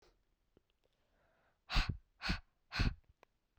{"exhalation_length": "3.6 s", "exhalation_amplitude": 3210, "exhalation_signal_mean_std_ratio": 0.3, "survey_phase": "beta (2021-08-13 to 2022-03-07)", "age": "18-44", "gender": "Female", "wearing_mask": "No", "symptom_cough_any": true, "symptom_runny_or_blocked_nose": true, "symptom_sore_throat": true, "symptom_headache": true, "symptom_onset": "3 days", "smoker_status": "Never smoked", "respiratory_condition_asthma": false, "respiratory_condition_other": false, "recruitment_source": "Test and Trace", "submission_delay": "2 days", "covid_test_result": "Positive", "covid_test_method": "RT-qPCR", "covid_ct_value": 19.1, "covid_ct_gene": "ORF1ab gene", "covid_ct_mean": 19.3, "covid_viral_load": "460000 copies/ml", "covid_viral_load_category": "Low viral load (10K-1M copies/ml)"}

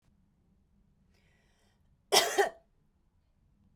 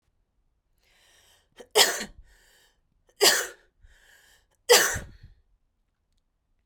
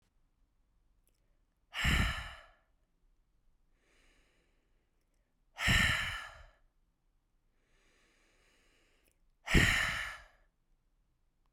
{"cough_length": "3.8 s", "cough_amplitude": 14998, "cough_signal_mean_std_ratio": 0.23, "three_cough_length": "6.7 s", "three_cough_amplitude": 24856, "three_cough_signal_mean_std_ratio": 0.26, "exhalation_length": "11.5 s", "exhalation_amplitude": 9083, "exhalation_signal_mean_std_ratio": 0.3, "survey_phase": "beta (2021-08-13 to 2022-03-07)", "age": "45-64", "gender": "Female", "wearing_mask": "No", "symptom_cough_any": true, "symptom_runny_or_blocked_nose": true, "symptom_fatigue": true, "symptom_headache": true, "symptom_change_to_sense_of_smell_or_taste": true, "symptom_other": true, "symptom_onset": "2 days", "smoker_status": "Never smoked", "respiratory_condition_asthma": false, "respiratory_condition_other": false, "recruitment_source": "Test and Trace", "submission_delay": "2 days", "covid_test_result": "Positive", "covid_test_method": "RT-qPCR", "covid_ct_value": 16.2, "covid_ct_gene": "ORF1ab gene", "covid_ct_mean": 16.5, "covid_viral_load": "4000000 copies/ml", "covid_viral_load_category": "High viral load (>1M copies/ml)"}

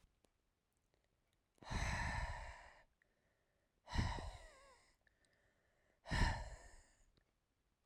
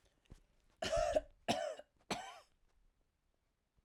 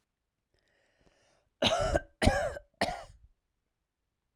{"exhalation_length": "7.9 s", "exhalation_amplitude": 2048, "exhalation_signal_mean_std_ratio": 0.38, "three_cough_length": "3.8 s", "three_cough_amplitude": 2864, "three_cough_signal_mean_std_ratio": 0.38, "cough_length": "4.4 s", "cough_amplitude": 11706, "cough_signal_mean_std_ratio": 0.34, "survey_phase": "alpha (2021-03-01 to 2021-08-12)", "age": "45-64", "gender": "Female", "wearing_mask": "No", "symptom_none": true, "smoker_status": "Ex-smoker", "respiratory_condition_asthma": false, "respiratory_condition_other": false, "recruitment_source": "REACT", "submission_delay": "1 day", "covid_test_result": "Negative", "covid_test_method": "RT-qPCR"}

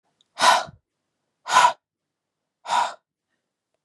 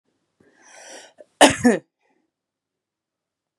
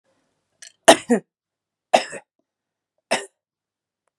{"exhalation_length": "3.8 s", "exhalation_amplitude": 26480, "exhalation_signal_mean_std_ratio": 0.32, "cough_length": "3.6 s", "cough_amplitude": 32768, "cough_signal_mean_std_ratio": 0.21, "three_cough_length": "4.2 s", "three_cough_amplitude": 32768, "three_cough_signal_mean_std_ratio": 0.2, "survey_phase": "beta (2021-08-13 to 2022-03-07)", "age": "18-44", "gender": "Female", "wearing_mask": "No", "symptom_cough_any": true, "symptom_new_continuous_cough": true, "symptom_sore_throat": true, "symptom_fatigue": true, "symptom_fever_high_temperature": true, "symptom_headache": true, "smoker_status": "Current smoker (1 to 10 cigarettes per day)", "respiratory_condition_asthma": false, "respiratory_condition_other": false, "recruitment_source": "Test and Trace", "submission_delay": "1 day", "covid_test_result": "Positive", "covid_test_method": "RT-qPCR", "covid_ct_value": 17.5, "covid_ct_gene": "ORF1ab gene", "covid_ct_mean": 18.0, "covid_viral_load": "1300000 copies/ml", "covid_viral_load_category": "High viral load (>1M copies/ml)"}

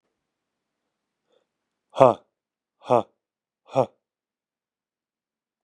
{"exhalation_length": "5.6 s", "exhalation_amplitude": 32755, "exhalation_signal_mean_std_ratio": 0.16, "survey_phase": "beta (2021-08-13 to 2022-03-07)", "age": "45-64", "gender": "Male", "wearing_mask": "No", "symptom_none": true, "smoker_status": "Ex-smoker", "respiratory_condition_asthma": false, "respiratory_condition_other": false, "recruitment_source": "REACT", "submission_delay": "1 day", "covid_test_result": "Negative", "covid_test_method": "RT-qPCR", "influenza_a_test_result": "Negative", "influenza_b_test_result": "Negative"}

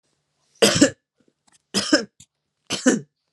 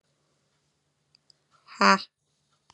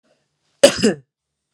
{"three_cough_length": "3.3 s", "three_cough_amplitude": 31619, "three_cough_signal_mean_std_ratio": 0.34, "exhalation_length": "2.7 s", "exhalation_amplitude": 22169, "exhalation_signal_mean_std_ratio": 0.18, "cough_length": "1.5 s", "cough_amplitude": 32768, "cough_signal_mean_std_ratio": 0.27, "survey_phase": "alpha (2021-03-01 to 2021-08-12)", "age": "45-64", "gender": "Female", "wearing_mask": "Yes", "symptom_fatigue": true, "smoker_status": "Current smoker (1 to 10 cigarettes per day)", "respiratory_condition_asthma": false, "respiratory_condition_other": false, "recruitment_source": "REACT", "submission_delay": "2 days", "covid_test_result": "Negative", "covid_test_method": "RT-qPCR"}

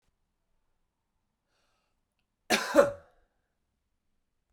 {"cough_length": "4.5 s", "cough_amplitude": 15699, "cough_signal_mean_std_ratio": 0.2, "survey_phase": "beta (2021-08-13 to 2022-03-07)", "age": "18-44", "gender": "Male", "wearing_mask": "No", "symptom_cough_any": true, "symptom_runny_or_blocked_nose": true, "symptom_fatigue": true, "symptom_headache": true, "symptom_onset": "4 days", "smoker_status": "Ex-smoker", "respiratory_condition_asthma": true, "respiratory_condition_other": false, "recruitment_source": "Test and Trace", "submission_delay": "2 days", "covid_test_result": "Positive", "covid_test_method": "RT-qPCR", "covid_ct_value": 12.9, "covid_ct_gene": "ORF1ab gene", "covid_ct_mean": 13.3, "covid_viral_load": "43000000 copies/ml", "covid_viral_load_category": "High viral load (>1M copies/ml)"}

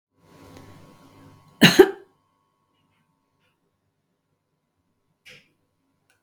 {"cough_length": "6.2 s", "cough_amplitude": 32768, "cough_signal_mean_std_ratio": 0.15, "survey_phase": "beta (2021-08-13 to 2022-03-07)", "age": "65+", "gender": "Female", "wearing_mask": "No", "symptom_none": true, "smoker_status": "Ex-smoker", "respiratory_condition_asthma": false, "respiratory_condition_other": false, "recruitment_source": "REACT", "submission_delay": "2 days", "covid_test_result": "Negative", "covid_test_method": "RT-qPCR", "influenza_a_test_result": "Unknown/Void", "influenza_b_test_result": "Unknown/Void"}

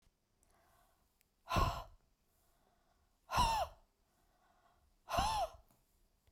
{"exhalation_length": "6.3 s", "exhalation_amplitude": 3245, "exhalation_signal_mean_std_ratio": 0.35, "survey_phase": "beta (2021-08-13 to 2022-03-07)", "age": "45-64", "gender": "Female", "wearing_mask": "No", "symptom_none": true, "smoker_status": "Ex-smoker", "respiratory_condition_asthma": true, "respiratory_condition_other": false, "recruitment_source": "REACT", "submission_delay": "1 day", "covid_test_result": "Negative", "covid_test_method": "RT-qPCR"}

